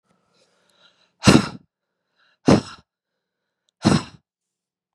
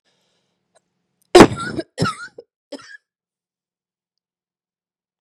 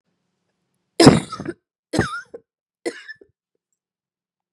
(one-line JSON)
{"exhalation_length": "4.9 s", "exhalation_amplitude": 32767, "exhalation_signal_mean_std_ratio": 0.24, "cough_length": "5.2 s", "cough_amplitude": 32768, "cough_signal_mean_std_ratio": 0.19, "three_cough_length": "4.5 s", "three_cough_amplitude": 32768, "three_cough_signal_mean_std_ratio": 0.23, "survey_phase": "beta (2021-08-13 to 2022-03-07)", "age": "45-64", "gender": "Female", "wearing_mask": "No", "symptom_runny_or_blocked_nose": true, "symptom_shortness_of_breath": true, "symptom_fatigue": true, "symptom_fever_high_temperature": true, "symptom_headache": true, "symptom_change_to_sense_of_smell_or_taste": true, "symptom_loss_of_taste": true, "symptom_other": true, "symptom_onset": "4 days", "smoker_status": "Ex-smoker", "respiratory_condition_asthma": true, "respiratory_condition_other": false, "recruitment_source": "Test and Trace", "submission_delay": "2 days", "covid_test_result": "Positive", "covid_test_method": "RT-qPCR"}